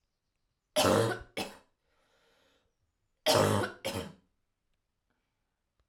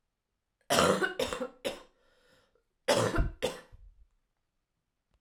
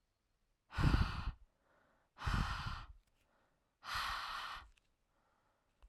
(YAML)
three_cough_length: 5.9 s
three_cough_amplitude: 9426
three_cough_signal_mean_std_ratio: 0.34
cough_length: 5.2 s
cough_amplitude: 15416
cough_signal_mean_std_ratio: 0.39
exhalation_length: 5.9 s
exhalation_amplitude: 3622
exhalation_signal_mean_std_ratio: 0.42
survey_phase: alpha (2021-03-01 to 2021-08-12)
age: 18-44
gender: Female
wearing_mask: 'No'
symptom_cough_any: true
symptom_shortness_of_breath: true
symptom_fatigue: true
symptom_headache: true
symptom_onset: 4 days
smoker_status: Never smoked
respiratory_condition_asthma: false
respiratory_condition_other: false
recruitment_source: Test and Trace
submission_delay: 2 days
covid_test_result: Positive
covid_test_method: RT-qPCR
covid_ct_value: 15.4
covid_ct_gene: ORF1ab gene